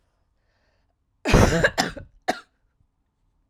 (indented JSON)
{
  "cough_length": "3.5 s",
  "cough_amplitude": 29002,
  "cough_signal_mean_std_ratio": 0.32,
  "survey_phase": "alpha (2021-03-01 to 2021-08-12)",
  "age": "18-44",
  "gender": "Female",
  "wearing_mask": "No",
  "symptom_none": true,
  "smoker_status": "Never smoked",
  "respiratory_condition_asthma": true,
  "respiratory_condition_other": false,
  "recruitment_source": "REACT",
  "submission_delay": "5 days",
  "covid_test_result": "Negative",
  "covid_test_method": "RT-qPCR"
}